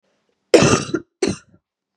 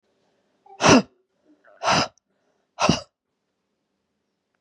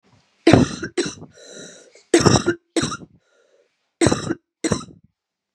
{"cough_length": "2.0 s", "cough_amplitude": 32768, "cough_signal_mean_std_ratio": 0.36, "exhalation_length": "4.6 s", "exhalation_amplitude": 28216, "exhalation_signal_mean_std_ratio": 0.27, "three_cough_length": "5.5 s", "three_cough_amplitude": 32768, "three_cough_signal_mean_std_ratio": 0.36, "survey_phase": "beta (2021-08-13 to 2022-03-07)", "age": "18-44", "gender": "Female", "wearing_mask": "No", "symptom_cough_any": true, "symptom_runny_or_blocked_nose": true, "symptom_fatigue": true, "smoker_status": "Never smoked", "respiratory_condition_asthma": false, "respiratory_condition_other": false, "recruitment_source": "Test and Trace", "submission_delay": "2 days", "covid_test_result": "Positive", "covid_test_method": "ePCR"}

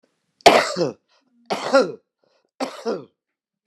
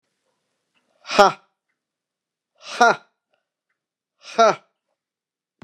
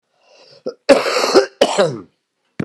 {"three_cough_length": "3.7 s", "three_cough_amplitude": 29204, "three_cough_signal_mean_std_ratio": 0.34, "exhalation_length": "5.6 s", "exhalation_amplitude": 29204, "exhalation_signal_mean_std_ratio": 0.23, "cough_length": "2.6 s", "cough_amplitude": 29204, "cough_signal_mean_std_ratio": 0.45, "survey_phase": "beta (2021-08-13 to 2022-03-07)", "age": "65+", "gender": "Male", "wearing_mask": "No", "symptom_cough_any": true, "symptom_runny_or_blocked_nose": true, "symptom_change_to_sense_of_smell_or_taste": true, "symptom_onset": "3 days", "smoker_status": "Never smoked", "respiratory_condition_asthma": false, "respiratory_condition_other": false, "recruitment_source": "REACT", "submission_delay": "1 day", "covid_test_result": "Negative", "covid_test_method": "RT-qPCR", "influenza_a_test_result": "Negative", "influenza_b_test_result": "Negative"}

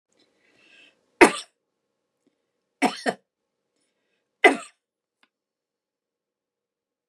{"three_cough_length": "7.1 s", "three_cough_amplitude": 32768, "three_cough_signal_mean_std_ratio": 0.16, "survey_phase": "beta (2021-08-13 to 2022-03-07)", "age": "65+", "gender": "Female", "wearing_mask": "No", "symptom_none": true, "smoker_status": "Ex-smoker", "respiratory_condition_asthma": false, "respiratory_condition_other": false, "recruitment_source": "REACT", "submission_delay": "2 days", "covid_test_result": "Negative", "covid_test_method": "RT-qPCR"}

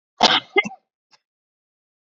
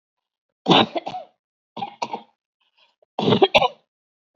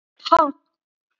{"cough_length": "2.1 s", "cough_amplitude": 28972, "cough_signal_mean_std_ratio": 0.27, "three_cough_length": "4.4 s", "three_cough_amplitude": 28364, "three_cough_signal_mean_std_ratio": 0.32, "exhalation_length": "1.2 s", "exhalation_amplitude": 27301, "exhalation_signal_mean_std_ratio": 0.31, "survey_phase": "beta (2021-08-13 to 2022-03-07)", "age": "45-64", "gender": "Female", "wearing_mask": "Yes", "symptom_none": true, "smoker_status": "Never smoked", "respiratory_condition_asthma": false, "respiratory_condition_other": false, "recruitment_source": "REACT", "submission_delay": "1 day", "covid_test_result": "Negative", "covid_test_method": "RT-qPCR", "influenza_a_test_result": "Negative", "influenza_b_test_result": "Negative"}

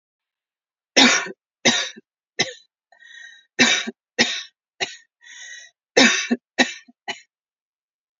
{"three_cough_length": "8.2 s", "three_cough_amplitude": 32768, "three_cough_signal_mean_std_ratio": 0.34, "survey_phase": "beta (2021-08-13 to 2022-03-07)", "age": "18-44", "gender": "Female", "wearing_mask": "No", "symptom_none": true, "smoker_status": "Ex-smoker", "respiratory_condition_asthma": false, "respiratory_condition_other": false, "recruitment_source": "REACT", "submission_delay": "3 days", "covid_test_result": "Negative", "covid_test_method": "RT-qPCR", "influenza_a_test_result": "Negative", "influenza_b_test_result": "Negative"}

